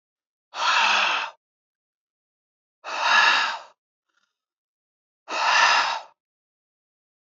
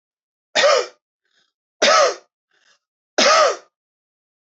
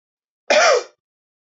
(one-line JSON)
{"exhalation_length": "7.3 s", "exhalation_amplitude": 19227, "exhalation_signal_mean_std_ratio": 0.44, "three_cough_length": "4.5 s", "three_cough_amplitude": 26929, "three_cough_signal_mean_std_ratio": 0.39, "cough_length": "1.5 s", "cough_amplitude": 22246, "cough_signal_mean_std_ratio": 0.39, "survey_phase": "beta (2021-08-13 to 2022-03-07)", "age": "18-44", "gender": "Male", "wearing_mask": "No", "symptom_fatigue": true, "symptom_onset": "13 days", "smoker_status": "Never smoked", "respiratory_condition_asthma": false, "respiratory_condition_other": false, "recruitment_source": "REACT", "submission_delay": "2 days", "covid_test_result": "Negative", "covid_test_method": "RT-qPCR", "influenza_a_test_result": "Negative", "influenza_b_test_result": "Negative"}